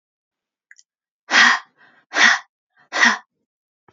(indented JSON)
{
  "exhalation_length": "3.9 s",
  "exhalation_amplitude": 30001,
  "exhalation_signal_mean_std_ratio": 0.34,
  "survey_phase": "alpha (2021-03-01 to 2021-08-12)",
  "age": "45-64",
  "gender": "Female",
  "wearing_mask": "No",
  "symptom_none": true,
  "smoker_status": "Ex-smoker",
  "respiratory_condition_asthma": false,
  "respiratory_condition_other": false,
  "recruitment_source": "REACT",
  "submission_delay": "7 days",
  "covid_test_result": "Negative",
  "covid_test_method": "RT-qPCR"
}